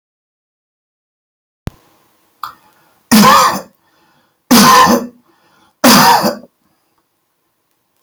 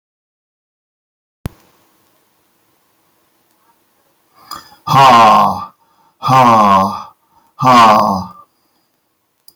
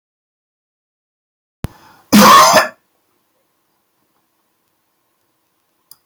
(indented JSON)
{
  "three_cough_length": "8.0 s",
  "three_cough_amplitude": 32768,
  "three_cough_signal_mean_std_ratio": 0.39,
  "exhalation_length": "9.6 s",
  "exhalation_amplitude": 32768,
  "exhalation_signal_mean_std_ratio": 0.41,
  "cough_length": "6.1 s",
  "cough_amplitude": 32768,
  "cough_signal_mean_std_ratio": 0.26,
  "survey_phase": "alpha (2021-03-01 to 2021-08-12)",
  "age": "65+",
  "gender": "Male",
  "wearing_mask": "No",
  "symptom_none": true,
  "smoker_status": "Never smoked",
  "respiratory_condition_asthma": false,
  "respiratory_condition_other": false,
  "recruitment_source": "REACT",
  "submission_delay": "1 day",
  "covid_test_result": "Negative",
  "covid_test_method": "RT-qPCR"
}